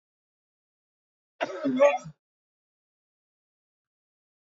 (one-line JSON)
{"cough_length": "4.5 s", "cough_amplitude": 13758, "cough_signal_mean_std_ratio": 0.24, "survey_phase": "beta (2021-08-13 to 2022-03-07)", "age": "65+", "gender": "Male", "wearing_mask": "No", "symptom_none": true, "smoker_status": "Never smoked", "respiratory_condition_asthma": false, "respiratory_condition_other": false, "recruitment_source": "REACT", "submission_delay": "3 days", "covid_test_result": "Negative", "covid_test_method": "RT-qPCR", "influenza_a_test_result": "Negative", "influenza_b_test_result": "Negative"}